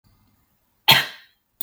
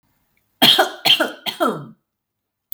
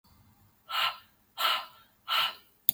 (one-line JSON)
{"cough_length": "1.6 s", "cough_amplitude": 32766, "cough_signal_mean_std_ratio": 0.25, "three_cough_length": "2.7 s", "three_cough_amplitude": 32768, "three_cough_signal_mean_std_ratio": 0.4, "exhalation_length": "2.7 s", "exhalation_amplitude": 26159, "exhalation_signal_mean_std_ratio": 0.41, "survey_phase": "beta (2021-08-13 to 2022-03-07)", "age": "18-44", "gender": "Female", "wearing_mask": "No", "symptom_none": true, "smoker_status": "Never smoked", "recruitment_source": "REACT", "submission_delay": "5 days", "covid_test_result": "Negative", "covid_test_method": "RT-qPCR", "influenza_a_test_result": "Negative", "influenza_b_test_result": "Negative"}